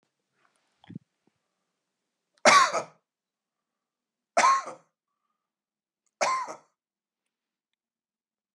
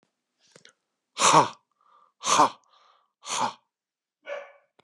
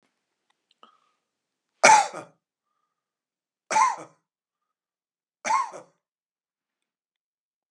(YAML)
cough_length: 8.5 s
cough_amplitude: 24450
cough_signal_mean_std_ratio: 0.24
exhalation_length: 4.8 s
exhalation_amplitude: 22629
exhalation_signal_mean_std_ratio: 0.3
three_cough_length: 7.7 s
three_cough_amplitude: 30406
three_cough_signal_mean_std_ratio: 0.22
survey_phase: beta (2021-08-13 to 2022-03-07)
age: 45-64
gender: Male
wearing_mask: 'No'
symptom_none: true
smoker_status: Never smoked
respiratory_condition_asthma: false
respiratory_condition_other: false
recruitment_source: REACT
submission_delay: 1 day
covid_test_result: Negative
covid_test_method: RT-qPCR
influenza_a_test_result: Negative
influenza_b_test_result: Negative